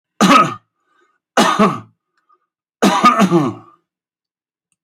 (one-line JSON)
{"cough_length": "4.8 s", "cough_amplitude": 31147, "cough_signal_mean_std_ratio": 0.44, "survey_phase": "alpha (2021-03-01 to 2021-08-12)", "age": "65+", "gender": "Male", "wearing_mask": "No", "symptom_none": true, "smoker_status": "Ex-smoker", "respiratory_condition_asthma": false, "respiratory_condition_other": false, "recruitment_source": "REACT", "submission_delay": "2 days", "covid_test_result": "Negative", "covid_test_method": "RT-qPCR"}